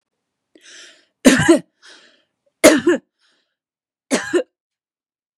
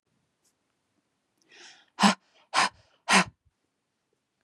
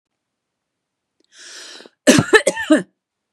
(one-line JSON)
{"three_cough_length": "5.4 s", "three_cough_amplitude": 32768, "three_cough_signal_mean_std_ratio": 0.3, "exhalation_length": "4.4 s", "exhalation_amplitude": 18774, "exhalation_signal_mean_std_ratio": 0.25, "cough_length": "3.3 s", "cough_amplitude": 32768, "cough_signal_mean_std_ratio": 0.3, "survey_phase": "beta (2021-08-13 to 2022-03-07)", "age": "45-64", "gender": "Female", "wearing_mask": "No", "symptom_abdominal_pain": true, "smoker_status": "Never smoked", "respiratory_condition_asthma": false, "respiratory_condition_other": false, "recruitment_source": "REACT", "submission_delay": "2 days", "covid_test_result": "Negative", "covid_test_method": "RT-qPCR", "influenza_a_test_result": "Negative", "influenza_b_test_result": "Negative"}